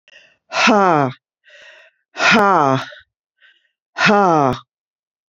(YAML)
exhalation_length: 5.3 s
exhalation_amplitude: 29854
exhalation_signal_mean_std_ratio: 0.46
survey_phase: beta (2021-08-13 to 2022-03-07)
age: 65+
gender: Female
wearing_mask: 'No'
symptom_new_continuous_cough: true
symptom_runny_or_blocked_nose: true
symptom_fatigue: true
symptom_fever_high_temperature: true
symptom_onset: 5 days
smoker_status: Never smoked
respiratory_condition_asthma: false
respiratory_condition_other: false
recruitment_source: Test and Trace
submission_delay: 2 days
covid_test_result: Positive
covid_test_method: ePCR